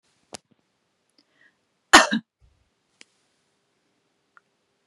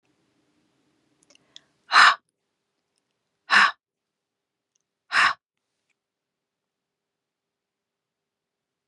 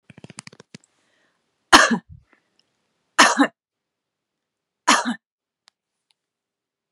{"cough_length": "4.9 s", "cough_amplitude": 32768, "cough_signal_mean_std_ratio": 0.14, "exhalation_length": "8.9 s", "exhalation_amplitude": 26892, "exhalation_signal_mean_std_ratio": 0.2, "three_cough_length": "6.9 s", "three_cough_amplitude": 32768, "three_cough_signal_mean_std_ratio": 0.23, "survey_phase": "beta (2021-08-13 to 2022-03-07)", "age": "45-64", "gender": "Female", "wearing_mask": "No", "symptom_none": true, "symptom_onset": "4 days", "smoker_status": "Never smoked", "respiratory_condition_asthma": false, "respiratory_condition_other": false, "recruitment_source": "REACT", "submission_delay": "2 days", "covid_test_result": "Negative", "covid_test_method": "RT-qPCR", "influenza_a_test_result": "Negative", "influenza_b_test_result": "Negative"}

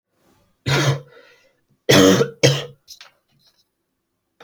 {"three_cough_length": "4.4 s", "three_cough_amplitude": 31140, "three_cough_signal_mean_std_ratio": 0.36, "survey_phase": "alpha (2021-03-01 to 2021-08-12)", "age": "18-44", "gender": "Male", "wearing_mask": "No", "symptom_cough_any": true, "symptom_onset": "4 days", "smoker_status": "Never smoked", "respiratory_condition_asthma": false, "respiratory_condition_other": false, "recruitment_source": "Test and Trace", "submission_delay": "2 days", "covid_test_result": "Positive", "covid_test_method": "RT-qPCR", "covid_ct_value": 16.7, "covid_ct_gene": "ORF1ab gene", "covid_ct_mean": 16.9, "covid_viral_load": "2800000 copies/ml", "covid_viral_load_category": "High viral load (>1M copies/ml)"}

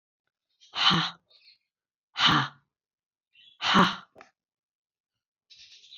{"exhalation_length": "6.0 s", "exhalation_amplitude": 15764, "exhalation_signal_mean_std_ratio": 0.32, "survey_phase": "beta (2021-08-13 to 2022-03-07)", "age": "65+", "gender": "Female", "wearing_mask": "No", "symptom_none": true, "smoker_status": "Never smoked", "respiratory_condition_asthma": false, "respiratory_condition_other": false, "recruitment_source": "REACT", "submission_delay": "-1 day", "covid_test_result": "Negative", "covid_test_method": "RT-qPCR", "influenza_a_test_result": "Negative", "influenza_b_test_result": "Negative"}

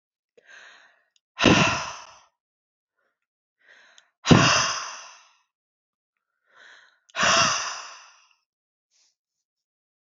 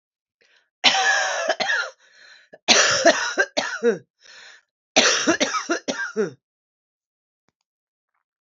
{"exhalation_length": "10.1 s", "exhalation_amplitude": 27487, "exhalation_signal_mean_std_ratio": 0.31, "cough_length": "8.5 s", "cough_amplitude": 32768, "cough_signal_mean_std_ratio": 0.47, "survey_phase": "alpha (2021-03-01 to 2021-08-12)", "age": "45-64", "gender": "Female", "wearing_mask": "No", "symptom_cough_any": true, "symptom_diarrhoea": true, "symptom_fatigue": true, "symptom_headache": true, "symptom_change_to_sense_of_smell_or_taste": true, "symptom_loss_of_taste": true, "symptom_onset": "5 days", "smoker_status": "Ex-smoker", "respiratory_condition_asthma": false, "respiratory_condition_other": false, "recruitment_source": "Test and Trace", "submission_delay": "2 days", "covid_test_result": "Positive", "covid_test_method": "RT-qPCR", "covid_ct_value": 18.1, "covid_ct_gene": "N gene", "covid_ct_mean": 18.4, "covid_viral_load": "950000 copies/ml", "covid_viral_load_category": "Low viral load (10K-1M copies/ml)"}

